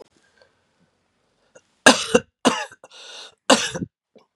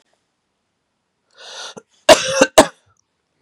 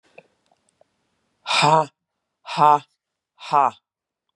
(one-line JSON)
{"three_cough_length": "4.4 s", "three_cough_amplitude": 32768, "three_cough_signal_mean_std_ratio": 0.26, "cough_length": "3.4 s", "cough_amplitude": 32768, "cough_signal_mean_std_ratio": 0.25, "exhalation_length": "4.4 s", "exhalation_amplitude": 25802, "exhalation_signal_mean_std_ratio": 0.31, "survey_phase": "beta (2021-08-13 to 2022-03-07)", "age": "45-64", "gender": "Female", "wearing_mask": "No", "symptom_cough_any": true, "symptom_runny_or_blocked_nose": true, "symptom_sore_throat": true, "symptom_fatigue": true, "symptom_headache": true, "symptom_other": true, "symptom_onset": "2 days", "smoker_status": "Never smoked", "respiratory_condition_asthma": false, "respiratory_condition_other": false, "recruitment_source": "Test and Trace", "submission_delay": "1 day", "covid_test_result": "Positive", "covid_test_method": "RT-qPCR", "covid_ct_value": 15.9, "covid_ct_gene": "ORF1ab gene", "covid_ct_mean": 16.2, "covid_viral_load": "4900000 copies/ml", "covid_viral_load_category": "High viral load (>1M copies/ml)"}